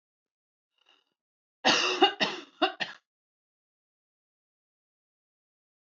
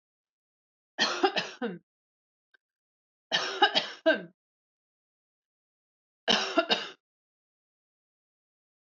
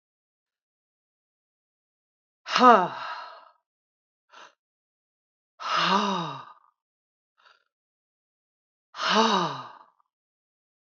{"cough_length": "5.9 s", "cough_amplitude": 12402, "cough_signal_mean_std_ratio": 0.26, "three_cough_length": "8.9 s", "three_cough_amplitude": 12415, "three_cough_signal_mean_std_ratio": 0.3, "exhalation_length": "10.8 s", "exhalation_amplitude": 23996, "exhalation_signal_mean_std_ratio": 0.28, "survey_phase": "alpha (2021-03-01 to 2021-08-12)", "age": "45-64", "gender": "Female", "wearing_mask": "No", "symptom_none": true, "smoker_status": "Ex-smoker", "respiratory_condition_asthma": false, "respiratory_condition_other": false, "recruitment_source": "Test and Trace", "submission_delay": "2 days", "covid_test_result": "Positive", "covid_test_method": "RT-qPCR", "covid_ct_value": 41.0, "covid_ct_gene": "N gene"}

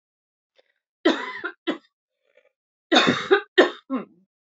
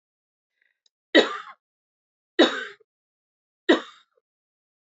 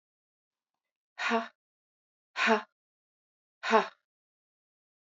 {"cough_length": "4.5 s", "cough_amplitude": 26167, "cough_signal_mean_std_ratio": 0.34, "three_cough_length": "4.9 s", "three_cough_amplitude": 22908, "three_cough_signal_mean_std_ratio": 0.23, "exhalation_length": "5.1 s", "exhalation_amplitude": 12545, "exhalation_signal_mean_std_ratio": 0.26, "survey_phase": "beta (2021-08-13 to 2022-03-07)", "age": "45-64", "gender": "Female", "wearing_mask": "No", "symptom_cough_any": true, "symptom_runny_or_blocked_nose": true, "symptom_sore_throat": true, "symptom_headache": true, "symptom_change_to_sense_of_smell_or_taste": true, "symptom_onset": "3 days", "smoker_status": "Ex-smoker", "respiratory_condition_asthma": false, "respiratory_condition_other": false, "recruitment_source": "Test and Trace", "submission_delay": "1 day", "covid_test_result": "Positive", "covid_test_method": "RT-qPCR", "covid_ct_value": 30.4, "covid_ct_gene": "ORF1ab gene", "covid_ct_mean": 31.2, "covid_viral_load": "58 copies/ml", "covid_viral_load_category": "Minimal viral load (< 10K copies/ml)"}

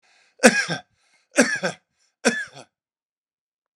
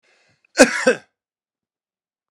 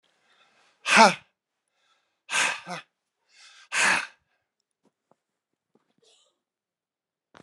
{"three_cough_length": "3.8 s", "three_cough_amplitude": 32767, "three_cough_signal_mean_std_ratio": 0.3, "cough_length": "2.3 s", "cough_amplitude": 32767, "cough_signal_mean_std_ratio": 0.25, "exhalation_length": "7.4 s", "exhalation_amplitude": 28246, "exhalation_signal_mean_std_ratio": 0.24, "survey_phase": "beta (2021-08-13 to 2022-03-07)", "age": "45-64", "gender": "Male", "wearing_mask": "No", "symptom_cough_any": true, "symptom_runny_or_blocked_nose": true, "symptom_diarrhoea": true, "symptom_fatigue": true, "symptom_headache": true, "smoker_status": "Never smoked", "respiratory_condition_asthma": true, "respiratory_condition_other": false, "recruitment_source": "Test and Trace", "submission_delay": "2 days", "covid_test_result": "Positive", "covid_test_method": "RT-qPCR"}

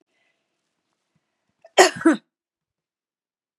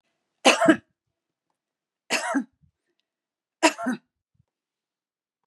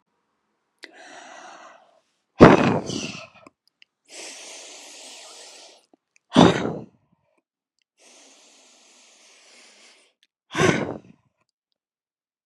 {"cough_length": "3.6 s", "cough_amplitude": 32767, "cough_signal_mean_std_ratio": 0.2, "three_cough_length": "5.5 s", "three_cough_amplitude": 25104, "three_cough_signal_mean_std_ratio": 0.27, "exhalation_length": "12.5 s", "exhalation_amplitude": 32768, "exhalation_signal_mean_std_ratio": 0.23, "survey_phase": "beta (2021-08-13 to 2022-03-07)", "age": "65+", "gender": "Female", "wearing_mask": "No", "symptom_none": true, "smoker_status": "Never smoked", "respiratory_condition_asthma": false, "respiratory_condition_other": false, "recruitment_source": "REACT", "submission_delay": "3 days", "covid_test_result": "Negative", "covid_test_method": "RT-qPCR", "influenza_a_test_result": "Negative", "influenza_b_test_result": "Negative"}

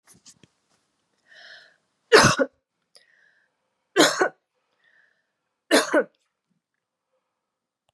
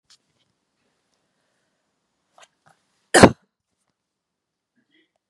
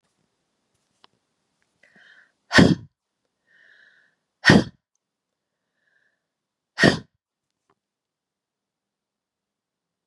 {"three_cough_length": "7.9 s", "three_cough_amplitude": 29072, "three_cough_signal_mean_std_ratio": 0.25, "cough_length": "5.3 s", "cough_amplitude": 32768, "cough_signal_mean_std_ratio": 0.12, "exhalation_length": "10.1 s", "exhalation_amplitude": 32767, "exhalation_signal_mean_std_ratio": 0.18, "survey_phase": "beta (2021-08-13 to 2022-03-07)", "age": "45-64", "gender": "Female", "wearing_mask": "No", "symptom_none": true, "smoker_status": "Never smoked", "respiratory_condition_asthma": false, "respiratory_condition_other": false, "recruitment_source": "REACT", "submission_delay": "1 day", "covid_test_result": "Negative", "covid_test_method": "RT-qPCR", "influenza_a_test_result": "Unknown/Void", "influenza_b_test_result": "Unknown/Void"}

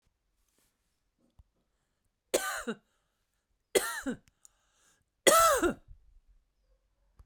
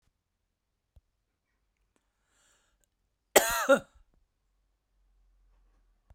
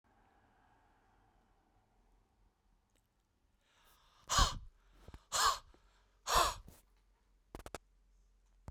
{"three_cough_length": "7.3 s", "three_cough_amplitude": 14949, "three_cough_signal_mean_std_ratio": 0.28, "cough_length": "6.1 s", "cough_amplitude": 18965, "cough_signal_mean_std_ratio": 0.18, "exhalation_length": "8.7 s", "exhalation_amplitude": 4809, "exhalation_signal_mean_std_ratio": 0.26, "survey_phase": "beta (2021-08-13 to 2022-03-07)", "age": "45-64", "gender": "Female", "wearing_mask": "No", "symptom_cough_any": true, "symptom_runny_or_blocked_nose": true, "smoker_status": "Never smoked", "respiratory_condition_asthma": false, "respiratory_condition_other": false, "recruitment_source": "Test and Trace", "submission_delay": "1 day", "covid_test_result": "Positive", "covid_test_method": "RT-qPCR", "covid_ct_value": 36.6, "covid_ct_gene": "ORF1ab gene"}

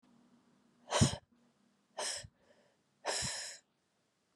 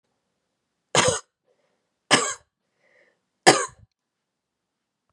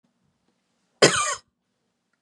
{"exhalation_length": "4.4 s", "exhalation_amplitude": 5297, "exhalation_signal_mean_std_ratio": 0.33, "three_cough_length": "5.1 s", "three_cough_amplitude": 32767, "three_cough_signal_mean_std_ratio": 0.24, "cough_length": "2.2 s", "cough_amplitude": 30267, "cough_signal_mean_std_ratio": 0.26, "survey_phase": "beta (2021-08-13 to 2022-03-07)", "age": "45-64", "gender": "Female", "wearing_mask": "No", "symptom_runny_or_blocked_nose": true, "smoker_status": "Never smoked", "respiratory_condition_asthma": false, "respiratory_condition_other": false, "recruitment_source": "Test and Trace", "submission_delay": "1 day", "covid_test_result": "Positive", "covid_test_method": "RT-qPCR"}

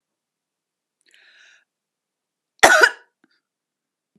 {"cough_length": "4.2 s", "cough_amplitude": 32768, "cough_signal_mean_std_ratio": 0.19, "survey_phase": "beta (2021-08-13 to 2022-03-07)", "age": "45-64", "gender": "Female", "wearing_mask": "No", "symptom_none": true, "smoker_status": "Never smoked", "respiratory_condition_asthma": false, "respiratory_condition_other": false, "recruitment_source": "REACT", "submission_delay": "2 days", "covid_test_result": "Negative", "covid_test_method": "RT-qPCR", "influenza_a_test_result": "Negative", "influenza_b_test_result": "Negative"}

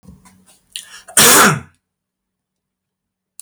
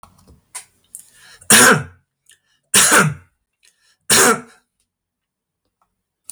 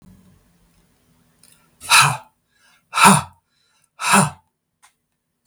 {"cough_length": "3.4 s", "cough_amplitude": 32768, "cough_signal_mean_std_ratio": 0.32, "three_cough_length": "6.3 s", "three_cough_amplitude": 32768, "three_cough_signal_mean_std_ratio": 0.34, "exhalation_length": "5.5 s", "exhalation_amplitude": 32768, "exhalation_signal_mean_std_ratio": 0.3, "survey_phase": "beta (2021-08-13 to 2022-03-07)", "age": "45-64", "gender": "Male", "wearing_mask": "No", "symptom_none": true, "smoker_status": "Never smoked", "respiratory_condition_asthma": false, "respiratory_condition_other": false, "recruitment_source": "REACT", "submission_delay": "4 days", "covid_test_result": "Negative", "covid_test_method": "RT-qPCR", "influenza_a_test_result": "Negative", "influenza_b_test_result": "Negative"}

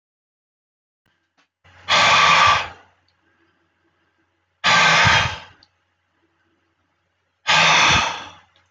{"exhalation_length": "8.7 s", "exhalation_amplitude": 26850, "exhalation_signal_mean_std_ratio": 0.43, "survey_phase": "beta (2021-08-13 to 2022-03-07)", "age": "65+", "gender": "Male", "wearing_mask": "No", "symptom_none": true, "smoker_status": "Ex-smoker", "respiratory_condition_asthma": false, "respiratory_condition_other": false, "recruitment_source": "REACT", "submission_delay": "1 day", "covid_test_result": "Negative", "covid_test_method": "RT-qPCR"}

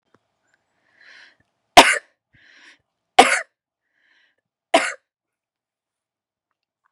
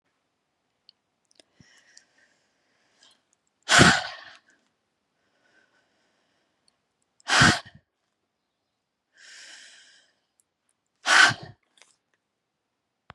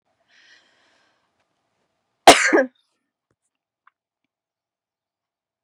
{"three_cough_length": "6.9 s", "three_cough_amplitude": 32768, "three_cough_signal_mean_std_ratio": 0.19, "exhalation_length": "13.1 s", "exhalation_amplitude": 29257, "exhalation_signal_mean_std_ratio": 0.21, "cough_length": "5.6 s", "cough_amplitude": 32768, "cough_signal_mean_std_ratio": 0.17, "survey_phase": "beta (2021-08-13 to 2022-03-07)", "age": "45-64", "gender": "Female", "wearing_mask": "No", "symptom_none": true, "smoker_status": "Current smoker (1 to 10 cigarettes per day)", "respiratory_condition_asthma": false, "respiratory_condition_other": false, "recruitment_source": "REACT", "submission_delay": "3 days", "covid_test_result": "Negative", "covid_test_method": "RT-qPCR", "influenza_a_test_result": "Negative", "influenza_b_test_result": "Negative"}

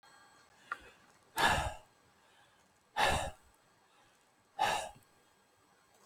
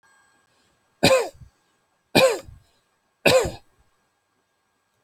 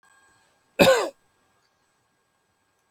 {"exhalation_length": "6.1 s", "exhalation_amplitude": 6212, "exhalation_signal_mean_std_ratio": 0.35, "three_cough_length": "5.0 s", "three_cough_amplitude": 30166, "three_cough_signal_mean_std_ratio": 0.3, "cough_length": "2.9 s", "cough_amplitude": 27534, "cough_signal_mean_std_ratio": 0.24, "survey_phase": "alpha (2021-03-01 to 2021-08-12)", "age": "65+", "gender": "Male", "wearing_mask": "No", "symptom_none": true, "smoker_status": "Never smoked", "respiratory_condition_asthma": false, "respiratory_condition_other": false, "recruitment_source": "REACT", "submission_delay": "3 days", "covid_test_result": "Negative", "covid_test_method": "RT-qPCR"}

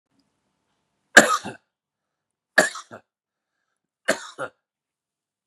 {"three_cough_length": "5.5 s", "three_cough_amplitude": 32768, "three_cough_signal_mean_std_ratio": 0.19, "survey_phase": "beta (2021-08-13 to 2022-03-07)", "age": "45-64", "gender": "Male", "wearing_mask": "No", "symptom_cough_any": true, "symptom_runny_or_blocked_nose": true, "symptom_sore_throat": true, "symptom_headache": true, "symptom_onset": "3 days", "smoker_status": "Ex-smoker", "respiratory_condition_asthma": false, "respiratory_condition_other": false, "recruitment_source": "Test and Trace", "submission_delay": "1 day", "covid_test_result": "Positive", "covid_test_method": "RT-qPCR", "covid_ct_value": 20.1, "covid_ct_gene": "N gene"}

